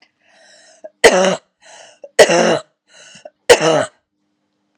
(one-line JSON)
{"three_cough_length": "4.8 s", "three_cough_amplitude": 32768, "three_cough_signal_mean_std_ratio": 0.37, "survey_phase": "beta (2021-08-13 to 2022-03-07)", "age": "18-44", "gender": "Female", "wearing_mask": "No", "symptom_cough_any": true, "symptom_runny_or_blocked_nose": true, "symptom_shortness_of_breath": true, "symptom_sore_throat": true, "symptom_fatigue": true, "symptom_headache": true, "symptom_change_to_sense_of_smell_or_taste": true, "symptom_onset": "9 days", "smoker_status": "Never smoked", "respiratory_condition_asthma": false, "respiratory_condition_other": false, "recruitment_source": "Test and Trace", "submission_delay": "1 day", "covid_test_result": "Positive", "covid_test_method": "RT-qPCR", "covid_ct_value": 26.0, "covid_ct_gene": "N gene"}